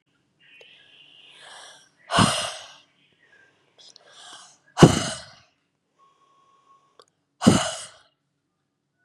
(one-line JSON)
{"exhalation_length": "9.0 s", "exhalation_amplitude": 32768, "exhalation_signal_mean_std_ratio": 0.23, "survey_phase": "beta (2021-08-13 to 2022-03-07)", "age": "18-44", "gender": "Female", "wearing_mask": "No", "symptom_none": true, "smoker_status": "Never smoked", "respiratory_condition_asthma": false, "respiratory_condition_other": false, "recruitment_source": "REACT", "submission_delay": "1 day", "covid_test_result": "Negative", "covid_test_method": "RT-qPCR", "influenza_a_test_result": "Negative", "influenza_b_test_result": "Negative"}